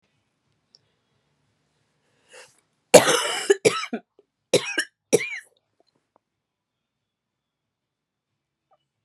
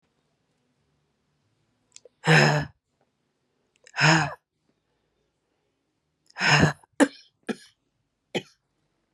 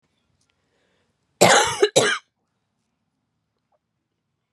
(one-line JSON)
{"three_cough_length": "9.0 s", "three_cough_amplitude": 32768, "three_cough_signal_mean_std_ratio": 0.22, "exhalation_length": "9.1 s", "exhalation_amplitude": 24728, "exhalation_signal_mean_std_ratio": 0.28, "cough_length": "4.5 s", "cough_amplitude": 31861, "cough_signal_mean_std_ratio": 0.28, "survey_phase": "beta (2021-08-13 to 2022-03-07)", "age": "45-64", "gender": "Female", "wearing_mask": "No", "symptom_cough_any": true, "symptom_new_continuous_cough": true, "symptom_fatigue": true, "symptom_fever_high_temperature": true, "symptom_headache": true, "symptom_change_to_sense_of_smell_or_taste": true, "symptom_loss_of_taste": true, "symptom_onset": "4 days", "smoker_status": "Ex-smoker", "respiratory_condition_asthma": false, "respiratory_condition_other": false, "recruitment_source": "Test and Trace", "submission_delay": "2 days", "covid_test_result": "Positive", "covid_test_method": "ePCR"}